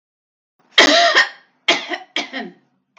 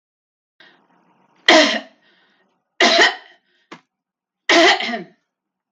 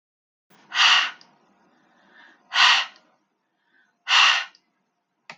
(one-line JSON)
{"cough_length": "3.0 s", "cough_amplitude": 32768, "cough_signal_mean_std_ratio": 0.42, "three_cough_length": "5.7 s", "three_cough_amplitude": 32768, "three_cough_signal_mean_std_ratio": 0.35, "exhalation_length": "5.4 s", "exhalation_amplitude": 24046, "exhalation_signal_mean_std_ratio": 0.35, "survey_phase": "beta (2021-08-13 to 2022-03-07)", "age": "45-64", "gender": "Female", "wearing_mask": "No", "symptom_none": true, "smoker_status": "Ex-smoker", "respiratory_condition_asthma": false, "respiratory_condition_other": false, "recruitment_source": "REACT", "submission_delay": "5 days", "covid_test_result": "Negative", "covid_test_method": "RT-qPCR", "influenza_a_test_result": "Negative", "influenza_b_test_result": "Negative"}